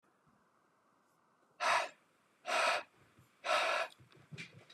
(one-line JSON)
{"exhalation_length": "4.7 s", "exhalation_amplitude": 3559, "exhalation_signal_mean_std_ratio": 0.42, "survey_phase": "beta (2021-08-13 to 2022-03-07)", "age": "18-44", "gender": "Male", "wearing_mask": "No", "symptom_none": true, "smoker_status": "Ex-smoker", "respiratory_condition_asthma": false, "respiratory_condition_other": false, "recruitment_source": "REACT", "submission_delay": "0 days", "covid_test_result": "Negative", "covid_test_method": "RT-qPCR", "influenza_a_test_result": "Negative", "influenza_b_test_result": "Negative"}